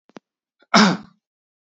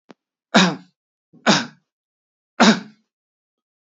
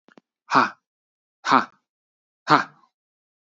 {"cough_length": "1.7 s", "cough_amplitude": 32767, "cough_signal_mean_std_ratio": 0.29, "three_cough_length": "3.8 s", "three_cough_amplitude": 28733, "three_cough_signal_mean_std_ratio": 0.3, "exhalation_length": "3.6 s", "exhalation_amplitude": 28164, "exhalation_signal_mean_std_ratio": 0.26, "survey_phase": "beta (2021-08-13 to 2022-03-07)", "age": "18-44", "gender": "Male", "wearing_mask": "No", "symptom_none": true, "smoker_status": "Never smoked", "respiratory_condition_asthma": false, "respiratory_condition_other": false, "recruitment_source": "REACT", "submission_delay": "3 days", "covid_test_result": "Negative", "covid_test_method": "RT-qPCR", "influenza_a_test_result": "Unknown/Void", "influenza_b_test_result": "Unknown/Void"}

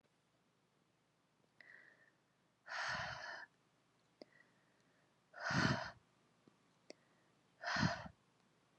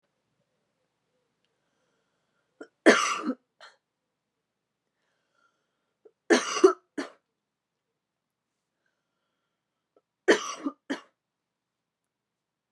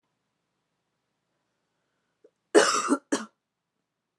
{"exhalation_length": "8.8 s", "exhalation_amplitude": 2644, "exhalation_signal_mean_std_ratio": 0.34, "three_cough_length": "12.7 s", "three_cough_amplitude": 21937, "three_cough_signal_mean_std_ratio": 0.2, "cough_length": "4.2 s", "cough_amplitude": 22499, "cough_signal_mean_std_ratio": 0.24, "survey_phase": "beta (2021-08-13 to 2022-03-07)", "age": "18-44", "gender": "Female", "wearing_mask": "No", "symptom_cough_any": true, "symptom_new_continuous_cough": true, "symptom_runny_or_blocked_nose": true, "symptom_shortness_of_breath": true, "symptom_sore_throat": true, "symptom_fatigue": true, "symptom_fever_high_temperature": true, "symptom_headache": true, "smoker_status": "Never smoked", "respiratory_condition_asthma": false, "respiratory_condition_other": false, "recruitment_source": "Test and Trace", "submission_delay": "1 day", "covid_test_result": "Positive", "covid_test_method": "RT-qPCR"}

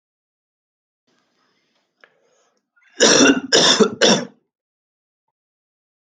{"cough_length": "6.1 s", "cough_amplitude": 32768, "cough_signal_mean_std_ratio": 0.32, "survey_phase": "alpha (2021-03-01 to 2021-08-12)", "age": "18-44", "gender": "Male", "wearing_mask": "No", "symptom_none": true, "smoker_status": "Never smoked", "respiratory_condition_asthma": false, "respiratory_condition_other": false, "recruitment_source": "REACT", "submission_delay": "1 day", "covid_test_result": "Negative", "covid_test_method": "RT-qPCR"}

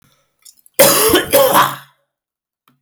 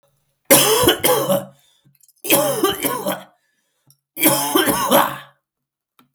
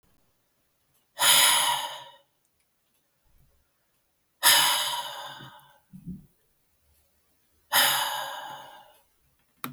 {"cough_length": "2.8 s", "cough_amplitude": 32768, "cough_signal_mean_std_ratio": 0.49, "three_cough_length": "6.1 s", "three_cough_amplitude": 32768, "three_cough_signal_mean_std_ratio": 0.54, "exhalation_length": "9.7 s", "exhalation_amplitude": 18184, "exhalation_signal_mean_std_ratio": 0.37, "survey_phase": "beta (2021-08-13 to 2022-03-07)", "age": "18-44", "gender": "Male", "wearing_mask": "No", "symptom_cough_any": true, "symptom_runny_or_blocked_nose": true, "symptom_fatigue": true, "symptom_onset": "3 days", "smoker_status": "Never smoked", "respiratory_condition_asthma": false, "respiratory_condition_other": false, "recruitment_source": "Test and Trace", "submission_delay": "2 days", "covid_test_result": "Positive", "covid_test_method": "RT-qPCR", "covid_ct_value": 16.7, "covid_ct_gene": "ORF1ab gene", "covid_ct_mean": 17.2, "covid_viral_load": "2300000 copies/ml", "covid_viral_load_category": "High viral load (>1M copies/ml)"}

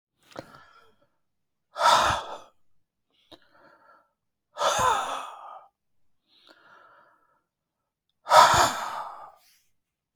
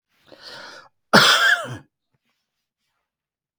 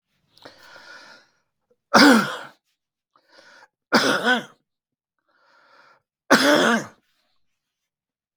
{"exhalation_length": "10.2 s", "exhalation_amplitude": 28234, "exhalation_signal_mean_std_ratio": 0.31, "cough_length": "3.6 s", "cough_amplitude": 32768, "cough_signal_mean_std_ratio": 0.32, "three_cough_length": "8.4 s", "three_cough_amplitude": 32766, "three_cough_signal_mean_std_ratio": 0.31, "survey_phase": "beta (2021-08-13 to 2022-03-07)", "age": "65+", "gender": "Male", "wearing_mask": "No", "symptom_cough_any": true, "symptom_other": true, "symptom_onset": "11 days", "smoker_status": "Never smoked", "respiratory_condition_asthma": false, "respiratory_condition_other": false, "recruitment_source": "REACT", "submission_delay": "1 day", "covid_test_result": "Negative", "covid_test_method": "RT-qPCR", "influenza_a_test_result": "Negative", "influenza_b_test_result": "Negative"}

